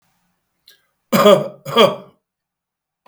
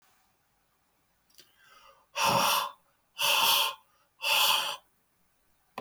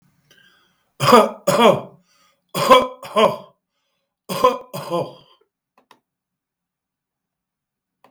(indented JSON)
{
  "cough_length": "3.1 s",
  "cough_amplitude": 32768,
  "cough_signal_mean_std_ratio": 0.33,
  "exhalation_length": "5.8 s",
  "exhalation_amplitude": 8708,
  "exhalation_signal_mean_std_ratio": 0.45,
  "three_cough_length": "8.1 s",
  "three_cough_amplitude": 32768,
  "three_cough_signal_mean_std_ratio": 0.33,
  "survey_phase": "beta (2021-08-13 to 2022-03-07)",
  "age": "65+",
  "gender": "Male",
  "wearing_mask": "No",
  "symptom_runny_or_blocked_nose": true,
  "smoker_status": "Current smoker (11 or more cigarettes per day)",
  "respiratory_condition_asthma": false,
  "respiratory_condition_other": false,
  "recruitment_source": "REACT",
  "submission_delay": "2 days",
  "covid_test_result": "Negative",
  "covid_test_method": "RT-qPCR",
  "influenza_a_test_result": "Negative",
  "influenza_b_test_result": "Negative"
}